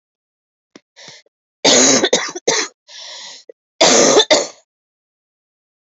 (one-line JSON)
{"cough_length": "6.0 s", "cough_amplitude": 32768, "cough_signal_mean_std_ratio": 0.41, "survey_phase": "beta (2021-08-13 to 2022-03-07)", "age": "18-44", "gender": "Female", "wearing_mask": "No", "symptom_cough_any": true, "symptom_new_continuous_cough": true, "symptom_runny_or_blocked_nose": true, "symptom_fatigue": true, "symptom_fever_high_temperature": true, "symptom_headache": true, "smoker_status": "Never smoked", "respiratory_condition_asthma": true, "respiratory_condition_other": false, "recruitment_source": "Test and Trace", "submission_delay": "2 days", "covid_test_result": "Positive", "covid_test_method": "ePCR"}